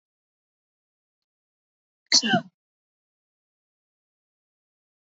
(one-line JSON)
{"cough_length": "5.1 s", "cough_amplitude": 21165, "cough_signal_mean_std_ratio": 0.17, "survey_phase": "beta (2021-08-13 to 2022-03-07)", "age": "45-64", "gender": "Female", "wearing_mask": "No", "symptom_none": true, "smoker_status": "Never smoked", "respiratory_condition_asthma": false, "respiratory_condition_other": false, "recruitment_source": "Test and Trace", "submission_delay": "1 day", "covid_test_result": "Negative", "covid_test_method": "RT-qPCR"}